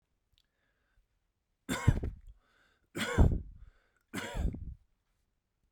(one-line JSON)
{"three_cough_length": "5.7 s", "three_cough_amplitude": 8788, "three_cough_signal_mean_std_ratio": 0.31, "survey_phase": "beta (2021-08-13 to 2022-03-07)", "age": "45-64", "gender": "Male", "wearing_mask": "No", "symptom_none": true, "smoker_status": "Never smoked", "respiratory_condition_asthma": false, "respiratory_condition_other": false, "recruitment_source": "REACT", "submission_delay": "1 day", "covid_test_result": "Negative", "covid_test_method": "RT-qPCR"}